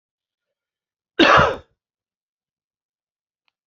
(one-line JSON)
{"cough_length": "3.7 s", "cough_amplitude": 27502, "cough_signal_mean_std_ratio": 0.24, "survey_phase": "beta (2021-08-13 to 2022-03-07)", "age": "65+", "gender": "Male", "wearing_mask": "No", "symptom_none": true, "smoker_status": "Never smoked", "respiratory_condition_asthma": false, "respiratory_condition_other": false, "recruitment_source": "REACT", "submission_delay": "1 day", "covid_test_result": "Negative", "covid_test_method": "RT-qPCR"}